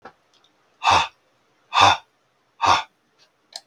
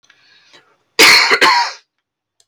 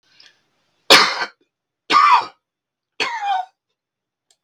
{"exhalation_length": "3.7 s", "exhalation_amplitude": 31532, "exhalation_signal_mean_std_ratio": 0.34, "cough_length": "2.5 s", "cough_amplitude": 32768, "cough_signal_mean_std_ratio": 0.45, "three_cough_length": "4.4 s", "three_cough_amplitude": 32768, "three_cough_signal_mean_std_ratio": 0.36, "survey_phase": "beta (2021-08-13 to 2022-03-07)", "age": "45-64", "gender": "Male", "wearing_mask": "No", "symptom_cough_any": true, "smoker_status": "Never smoked", "respiratory_condition_asthma": false, "respiratory_condition_other": false, "recruitment_source": "REACT", "submission_delay": "2 days", "covid_test_result": "Negative", "covid_test_method": "RT-qPCR"}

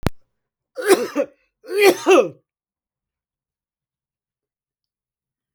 {"three_cough_length": "5.5 s", "three_cough_amplitude": 32768, "three_cough_signal_mean_std_ratio": 0.3, "survey_phase": "beta (2021-08-13 to 2022-03-07)", "age": "45-64", "gender": "Male", "wearing_mask": "No", "symptom_none": true, "smoker_status": "Never smoked", "respiratory_condition_asthma": false, "respiratory_condition_other": false, "recruitment_source": "REACT", "submission_delay": "0 days", "covid_test_result": "Negative", "covid_test_method": "RT-qPCR"}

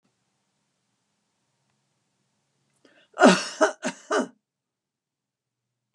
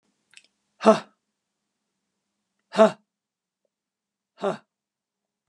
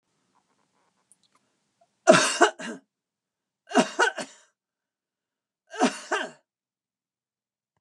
{"cough_length": "5.9 s", "cough_amplitude": 30258, "cough_signal_mean_std_ratio": 0.22, "exhalation_length": "5.5 s", "exhalation_amplitude": 28107, "exhalation_signal_mean_std_ratio": 0.18, "three_cough_length": "7.8 s", "three_cough_amplitude": 29904, "three_cough_signal_mean_std_ratio": 0.26, "survey_phase": "beta (2021-08-13 to 2022-03-07)", "age": "65+", "gender": "Female", "wearing_mask": "No", "symptom_none": true, "smoker_status": "Never smoked", "respiratory_condition_asthma": false, "respiratory_condition_other": false, "recruitment_source": "REACT", "submission_delay": "2 days", "covid_test_result": "Negative", "covid_test_method": "RT-qPCR"}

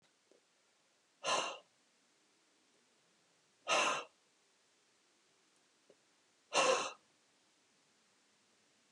{"exhalation_length": "8.9 s", "exhalation_amplitude": 3754, "exhalation_signal_mean_std_ratio": 0.28, "survey_phase": "beta (2021-08-13 to 2022-03-07)", "age": "65+", "gender": "Male", "wearing_mask": "No", "symptom_none": true, "smoker_status": "Never smoked", "respiratory_condition_asthma": false, "respiratory_condition_other": false, "recruitment_source": "REACT", "submission_delay": "5 days", "covid_test_result": "Negative", "covid_test_method": "RT-qPCR", "influenza_a_test_result": "Negative", "influenza_b_test_result": "Negative"}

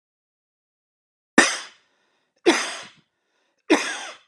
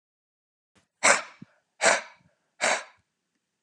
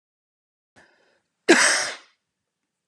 {"three_cough_length": "4.3 s", "three_cough_amplitude": 32765, "three_cough_signal_mean_std_ratio": 0.29, "exhalation_length": "3.6 s", "exhalation_amplitude": 25262, "exhalation_signal_mean_std_ratio": 0.3, "cough_length": "2.9 s", "cough_amplitude": 25494, "cough_signal_mean_std_ratio": 0.28, "survey_phase": "alpha (2021-03-01 to 2021-08-12)", "age": "45-64", "gender": "Male", "wearing_mask": "No", "symptom_none": true, "smoker_status": "Never smoked", "respiratory_condition_asthma": false, "respiratory_condition_other": false, "recruitment_source": "REACT", "submission_delay": "1 day", "covid_test_result": "Negative", "covid_test_method": "RT-qPCR"}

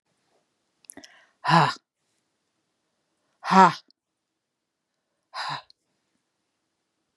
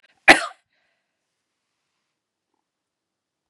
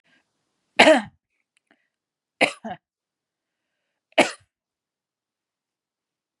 {"exhalation_length": "7.2 s", "exhalation_amplitude": 30187, "exhalation_signal_mean_std_ratio": 0.21, "cough_length": "3.5 s", "cough_amplitude": 32768, "cough_signal_mean_std_ratio": 0.13, "three_cough_length": "6.4 s", "three_cough_amplitude": 32767, "three_cough_signal_mean_std_ratio": 0.19, "survey_phase": "beta (2021-08-13 to 2022-03-07)", "age": "65+", "gender": "Female", "wearing_mask": "No", "symptom_runny_or_blocked_nose": true, "symptom_sore_throat": true, "symptom_onset": "3 days", "smoker_status": "Never smoked", "respiratory_condition_asthma": false, "respiratory_condition_other": false, "recruitment_source": "Test and Trace", "submission_delay": "2 days", "covid_test_result": "Positive", "covid_test_method": "RT-qPCR", "covid_ct_value": 25.4, "covid_ct_gene": "ORF1ab gene", "covid_ct_mean": 26.2, "covid_viral_load": "2600 copies/ml", "covid_viral_load_category": "Minimal viral load (< 10K copies/ml)"}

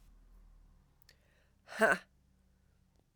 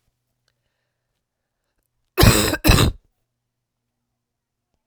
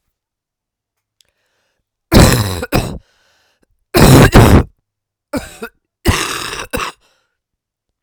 {"exhalation_length": "3.2 s", "exhalation_amplitude": 6162, "exhalation_signal_mean_std_ratio": 0.22, "cough_length": "4.9 s", "cough_amplitude": 32768, "cough_signal_mean_std_ratio": 0.27, "three_cough_length": "8.0 s", "three_cough_amplitude": 32768, "three_cough_signal_mean_std_ratio": 0.37, "survey_phase": "alpha (2021-03-01 to 2021-08-12)", "age": "45-64", "gender": "Female", "wearing_mask": "No", "symptom_cough_any": true, "symptom_abdominal_pain": true, "symptom_fatigue": true, "symptom_change_to_sense_of_smell_or_taste": true, "smoker_status": "Ex-smoker", "respiratory_condition_asthma": false, "respiratory_condition_other": false, "recruitment_source": "Test and Trace", "submission_delay": "1 day", "covid_test_result": "Positive", "covid_test_method": "RT-qPCR"}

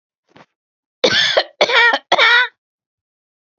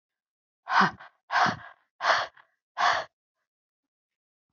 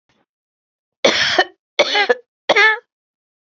{"cough_length": "3.6 s", "cough_amplitude": 32768, "cough_signal_mean_std_ratio": 0.45, "exhalation_length": "4.5 s", "exhalation_amplitude": 12848, "exhalation_signal_mean_std_ratio": 0.36, "three_cough_length": "3.5 s", "three_cough_amplitude": 32016, "three_cough_signal_mean_std_ratio": 0.41, "survey_phase": "beta (2021-08-13 to 2022-03-07)", "age": "45-64", "gender": "Female", "wearing_mask": "No", "symptom_none": true, "smoker_status": "Never smoked", "respiratory_condition_asthma": true, "respiratory_condition_other": false, "recruitment_source": "REACT", "submission_delay": "1 day", "covid_test_result": "Negative", "covid_test_method": "RT-qPCR", "influenza_a_test_result": "Negative", "influenza_b_test_result": "Negative"}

